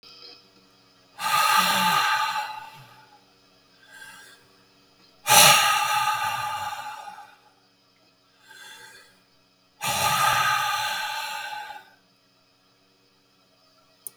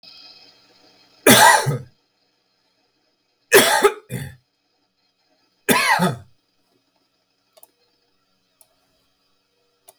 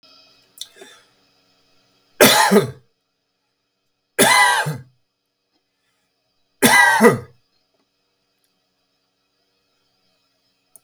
exhalation_length: 14.2 s
exhalation_amplitude: 32743
exhalation_signal_mean_std_ratio: 0.46
cough_length: 10.0 s
cough_amplitude: 32768
cough_signal_mean_std_ratio: 0.29
three_cough_length: 10.8 s
three_cough_amplitude: 32768
three_cough_signal_mean_std_ratio: 0.31
survey_phase: beta (2021-08-13 to 2022-03-07)
age: 65+
gender: Male
wearing_mask: 'No'
symptom_shortness_of_breath: true
symptom_headache: true
smoker_status: Ex-smoker
respiratory_condition_asthma: false
respiratory_condition_other: true
recruitment_source: REACT
submission_delay: 1 day
covid_test_result: Negative
covid_test_method: RT-qPCR
influenza_a_test_result: Negative
influenza_b_test_result: Negative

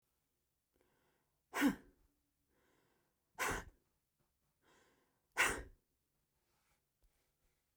exhalation_length: 7.8 s
exhalation_amplitude: 3204
exhalation_signal_mean_std_ratio: 0.23
survey_phase: beta (2021-08-13 to 2022-03-07)
age: 65+
gender: Female
wearing_mask: 'No'
symptom_cough_any: true
symptom_fatigue: true
smoker_status: Ex-smoker
respiratory_condition_asthma: true
respiratory_condition_other: false
recruitment_source: Test and Trace
submission_delay: 2 days
covid_test_result: Positive
covid_test_method: RT-qPCR
covid_ct_value: 25.2
covid_ct_gene: ORF1ab gene
covid_ct_mean: 25.7
covid_viral_load: 3800 copies/ml
covid_viral_load_category: Minimal viral load (< 10K copies/ml)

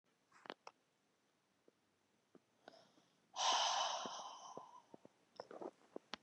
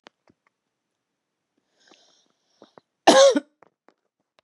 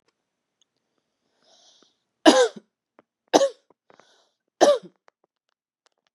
exhalation_length: 6.2 s
exhalation_amplitude: 1873
exhalation_signal_mean_std_ratio: 0.36
cough_length: 4.4 s
cough_amplitude: 32767
cough_signal_mean_std_ratio: 0.21
three_cough_length: 6.1 s
three_cough_amplitude: 32157
three_cough_signal_mean_std_ratio: 0.23
survey_phase: beta (2021-08-13 to 2022-03-07)
age: 45-64
gender: Female
wearing_mask: 'No'
symptom_runny_or_blocked_nose: true
smoker_status: Never smoked
respiratory_condition_asthma: false
respiratory_condition_other: false
recruitment_source: Test and Trace
submission_delay: 2 days
covid_test_result: Positive
covid_test_method: RT-qPCR
covid_ct_value: 33.3
covid_ct_gene: ORF1ab gene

